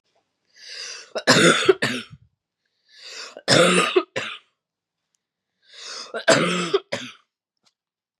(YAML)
three_cough_length: 8.2 s
three_cough_amplitude: 27865
three_cough_signal_mean_std_ratio: 0.39
survey_phase: beta (2021-08-13 to 2022-03-07)
age: 18-44
gender: Female
wearing_mask: 'No'
symptom_cough_any: true
symptom_abdominal_pain: true
symptom_fatigue: true
symptom_headache: true
smoker_status: Never smoked
respiratory_condition_asthma: false
respiratory_condition_other: false
recruitment_source: Test and Trace
submission_delay: 2 days
covid_test_result: Positive
covid_test_method: RT-qPCR
covid_ct_value: 23.6
covid_ct_gene: ORF1ab gene
covid_ct_mean: 25.7
covid_viral_load: 3700 copies/ml
covid_viral_load_category: Minimal viral load (< 10K copies/ml)